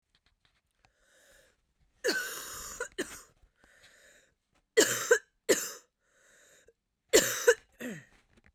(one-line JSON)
{"three_cough_length": "8.5 s", "three_cough_amplitude": 13077, "three_cough_signal_mean_std_ratio": 0.29, "survey_phase": "beta (2021-08-13 to 2022-03-07)", "age": "18-44", "gender": "Female", "wearing_mask": "No", "symptom_cough_any": true, "symptom_new_continuous_cough": true, "symptom_runny_or_blocked_nose": true, "symptom_headache": true, "symptom_onset": "5 days", "smoker_status": "Never smoked", "respiratory_condition_asthma": false, "respiratory_condition_other": false, "recruitment_source": "REACT", "submission_delay": "2 days", "covid_test_result": "Negative", "covid_test_method": "RT-qPCR", "influenza_a_test_result": "Unknown/Void", "influenza_b_test_result": "Unknown/Void"}